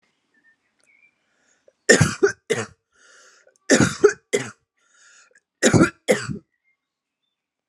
{"three_cough_length": "7.7 s", "three_cough_amplitude": 32766, "three_cough_signal_mean_std_ratio": 0.3, "survey_phase": "alpha (2021-03-01 to 2021-08-12)", "age": "18-44", "gender": "Female", "wearing_mask": "No", "symptom_none": true, "smoker_status": "Current smoker (11 or more cigarettes per day)", "respiratory_condition_asthma": false, "respiratory_condition_other": false, "recruitment_source": "REACT", "submission_delay": "2 days", "covid_test_result": "Negative", "covid_test_method": "RT-qPCR"}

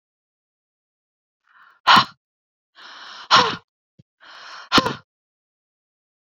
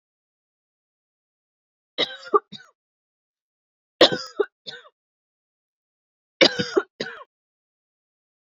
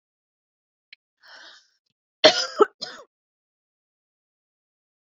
{"exhalation_length": "6.3 s", "exhalation_amplitude": 32768, "exhalation_signal_mean_std_ratio": 0.24, "three_cough_length": "8.5 s", "three_cough_amplitude": 30092, "three_cough_signal_mean_std_ratio": 0.2, "cough_length": "5.1 s", "cough_amplitude": 28478, "cough_signal_mean_std_ratio": 0.17, "survey_phase": "beta (2021-08-13 to 2022-03-07)", "age": "18-44", "gender": "Female", "wearing_mask": "No", "symptom_none": true, "smoker_status": "Ex-smoker", "respiratory_condition_asthma": false, "respiratory_condition_other": false, "recruitment_source": "REACT", "submission_delay": "2 days", "covid_test_result": "Negative", "covid_test_method": "RT-qPCR"}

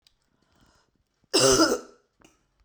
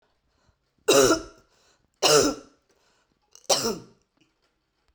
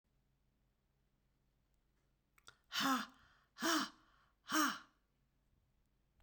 {"cough_length": "2.6 s", "cough_amplitude": 15529, "cough_signal_mean_std_ratio": 0.34, "three_cough_length": "4.9 s", "three_cough_amplitude": 18132, "three_cough_signal_mean_std_ratio": 0.33, "exhalation_length": "6.2 s", "exhalation_amplitude": 2470, "exhalation_signal_mean_std_ratio": 0.31, "survey_phase": "beta (2021-08-13 to 2022-03-07)", "age": "45-64", "gender": "Female", "wearing_mask": "No", "symptom_new_continuous_cough": true, "symptom_runny_or_blocked_nose": true, "symptom_shortness_of_breath": true, "symptom_sore_throat": true, "symptom_fatigue": true, "symptom_onset": "5 days", "smoker_status": "Never smoked", "respiratory_condition_asthma": false, "respiratory_condition_other": false, "recruitment_source": "Test and Trace", "submission_delay": "2 days", "covid_test_result": "Positive", "covid_test_method": "RT-qPCR", "covid_ct_value": 25.1, "covid_ct_gene": "ORF1ab gene"}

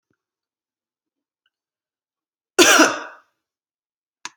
{"cough_length": "4.4 s", "cough_amplitude": 32171, "cough_signal_mean_std_ratio": 0.23, "survey_phase": "alpha (2021-03-01 to 2021-08-12)", "age": "45-64", "gender": "Female", "wearing_mask": "No", "symptom_none": true, "smoker_status": "Never smoked", "respiratory_condition_asthma": false, "respiratory_condition_other": false, "recruitment_source": "REACT", "submission_delay": "3 days", "covid_test_result": "Negative", "covid_test_method": "RT-qPCR"}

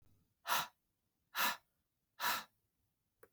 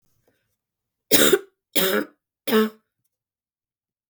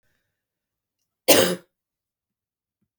{"exhalation_length": "3.3 s", "exhalation_amplitude": 2637, "exhalation_signal_mean_std_ratio": 0.34, "three_cough_length": "4.1 s", "three_cough_amplitude": 32768, "three_cough_signal_mean_std_ratio": 0.33, "cough_length": "3.0 s", "cough_amplitude": 32766, "cough_signal_mean_std_ratio": 0.22, "survey_phase": "beta (2021-08-13 to 2022-03-07)", "age": "18-44", "gender": "Female", "wearing_mask": "No", "symptom_cough_any": true, "symptom_runny_or_blocked_nose": true, "symptom_sore_throat": true, "symptom_fatigue": true, "symptom_headache": true, "symptom_onset": "2 days", "smoker_status": "Ex-smoker", "respiratory_condition_asthma": false, "respiratory_condition_other": false, "recruitment_source": "Test and Trace", "submission_delay": "1 day", "covid_test_result": "Positive", "covid_test_method": "RT-qPCR", "covid_ct_value": 20.1, "covid_ct_gene": "ORF1ab gene"}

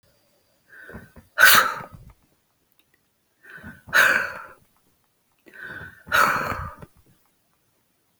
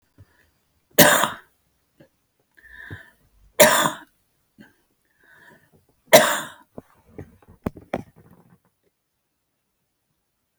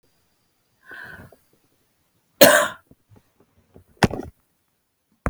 {"exhalation_length": "8.2 s", "exhalation_amplitude": 32768, "exhalation_signal_mean_std_ratio": 0.31, "three_cough_length": "10.6 s", "three_cough_amplitude": 32768, "three_cough_signal_mean_std_ratio": 0.23, "cough_length": "5.3 s", "cough_amplitude": 32768, "cough_signal_mean_std_ratio": 0.21, "survey_phase": "alpha (2021-03-01 to 2021-08-12)", "age": "65+", "gender": "Female", "wearing_mask": "No", "symptom_none": true, "smoker_status": "Never smoked", "respiratory_condition_asthma": false, "respiratory_condition_other": true, "recruitment_source": "REACT", "submission_delay": "2 days", "covid_test_result": "Negative", "covid_test_method": "RT-qPCR"}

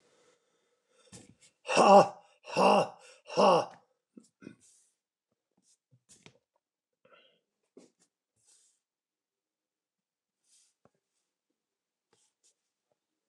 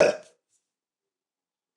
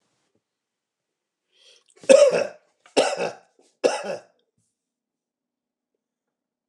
{"exhalation_length": "13.3 s", "exhalation_amplitude": 15863, "exhalation_signal_mean_std_ratio": 0.21, "cough_length": "1.8 s", "cough_amplitude": 17536, "cough_signal_mean_std_ratio": 0.22, "three_cough_length": "6.7 s", "three_cough_amplitude": 28497, "three_cough_signal_mean_std_ratio": 0.25, "survey_phase": "beta (2021-08-13 to 2022-03-07)", "age": "65+", "gender": "Male", "wearing_mask": "No", "symptom_cough_any": true, "symptom_runny_or_blocked_nose": true, "symptom_sore_throat": true, "symptom_change_to_sense_of_smell_or_taste": true, "symptom_onset": "3 days", "smoker_status": "Ex-smoker", "respiratory_condition_asthma": true, "respiratory_condition_other": false, "recruitment_source": "Test and Trace", "submission_delay": "2 days", "covid_test_result": "Positive", "covid_test_method": "RT-qPCR", "covid_ct_value": 14.2, "covid_ct_gene": "S gene", "covid_ct_mean": 14.7, "covid_viral_load": "15000000 copies/ml", "covid_viral_load_category": "High viral load (>1M copies/ml)"}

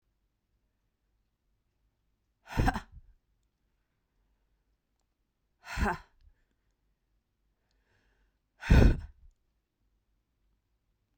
{"exhalation_length": "11.2 s", "exhalation_amplitude": 13207, "exhalation_signal_mean_std_ratio": 0.19, "survey_phase": "beta (2021-08-13 to 2022-03-07)", "age": "45-64", "gender": "Female", "wearing_mask": "No", "symptom_cough_any": true, "symptom_runny_or_blocked_nose": true, "symptom_fatigue": true, "smoker_status": "Ex-smoker", "respiratory_condition_asthma": true, "respiratory_condition_other": false, "recruitment_source": "Test and Trace", "submission_delay": "2 days", "covid_test_result": "Positive", "covid_test_method": "RT-qPCR", "covid_ct_value": 23.1, "covid_ct_gene": "ORF1ab gene", "covid_ct_mean": 23.9, "covid_viral_load": "15000 copies/ml", "covid_viral_load_category": "Low viral load (10K-1M copies/ml)"}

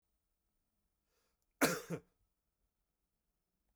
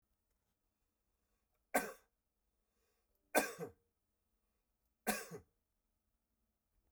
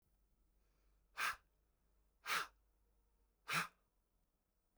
{"cough_length": "3.8 s", "cough_amplitude": 4681, "cough_signal_mean_std_ratio": 0.19, "three_cough_length": "6.9 s", "three_cough_amplitude": 4757, "three_cough_signal_mean_std_ratio": 0.21, "exhalation_length": "4.8 s", "exhalation_amplitude": 1676, "exhalation_signal_mean_std_ratio": 0.29, "survey_phase": "beta (2021-08-13 to 2022-03-07)", "age": "45-64", "gender": "Male", "wearing_mask": "No", "symptom_none": true, "smoker_status": "Ex-smoker", "respiratory_condition_asthma": true, "respiratory_condition_other": false, "recruitment_source": "REACT", "submission_delay": "0 days", "covid_test_result": "Negative", "covid_test_method": "RT-qPCR"}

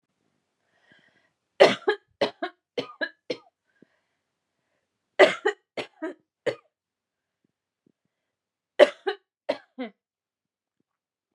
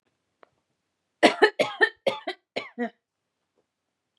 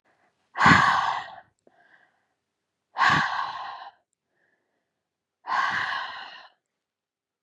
{"three_cough_length": "11.3 s", "three_cough_amplitude": 29248, "three_cough_signal_mean_std_ratio": 0.2, "cough_length": "4.2 s", "cough_amplitude": 24737, "cough_signal_mean_std_ratio": 0.27, "exhalation_length": "7.4 s", "exhalation_amplitude": 21479, "exhalation_signal_mean_std_ratio": 0.38, "survey_phase": "beta (2021-08-13 to 2022-03-07)", "age": "18-44", "gender": "Female", "wearing_mask": "No", "symptom_none": true, "smoker_status": "Never smoked", "respiratory_condition_asthma": false, "respiratory_condition_other": false, "recruitment_source": "REACT", "submission_delay": "1 day", "covid_test_result": "Negative", "covid_test_method": "RT-qPCR"}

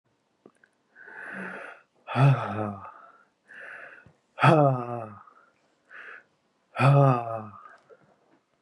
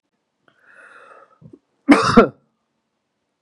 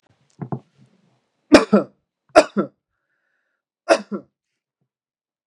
{"exhalation_length": "8.6 s", "exhalation_amplitude": 18965, "exhalation_signal_mean_std_ratio": 0.37, "cough_length": "3.4 s", "cough_amplitude": 32768, "cough_signal_mean_std_ratio": 0.25, "three_cough_length": "5.5 s", "three_cough_amplitude": 32768, "three_cough_signal_mean_std_ratio": 0.22, "survey_phase": "beta (2021-08-13 to 2022-03-07)", "age": "18-44", "gender": "Male", "wearing_mask": "No", "symptom_runny_or_blocked_nose": true, "symptom_fever_high_temperature": true, "symptom_onset": "2 days", "smoker_status": "Never smoked", "respiratory_condition_asthma": false, "respiratory_condition_other": false, "recruitment_source": "Test and Trace", "submission_delay": "1 day", "covid_test_result": "Positive", "covid_test_method": "ePCR"}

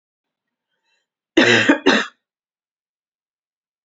{"cough_length": "3.8 s", "cough_amplitude": 28401, "cough_signal_mean_std_ratio": 0.3, "survey_phase": "beta (2021-08-13 to 2022-03-07)", "age": "18-44", "gender": "Female", "wearing_mask": "No", "symptom_cough_any": true, "symptom_runny_or_blocked_nose": true, "symptom_fever_high_temperature": true, "symptom_headache": true, "smoker_status": "Ex-smoker", "respiratory_condition_asthma": false, "respiratory_condition_other": false, "recruitment_source": "Test and Trace", "submission_delay": "2 days", "covid_test_result": "Positive", "covid_test_method": "RT-qPCR", "covid_ct_value": 19.7, "covid_ct_gene": "ORF1ab gene"}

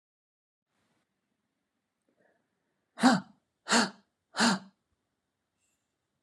{"exhalation_length": "6.2 s", "exhalation_amplitude": 11323, "exhalation_signal_mean_std_ratio": 0.24, "survey_phase": "beta (2021-08-13 to 2022-03-07)", "age": "45-64", "gender": "Female", "wearing_mask": "No", "symptom_none": true, "smoker_status": "Never smoked", "respiratory_condition_asthma": false, "respiratory_condition_other": false, "recruitment_source": "REACT", "submission_delay": "14 days", "covid_test_result": "Negative", "covid_test_method": "RT-qPCR"}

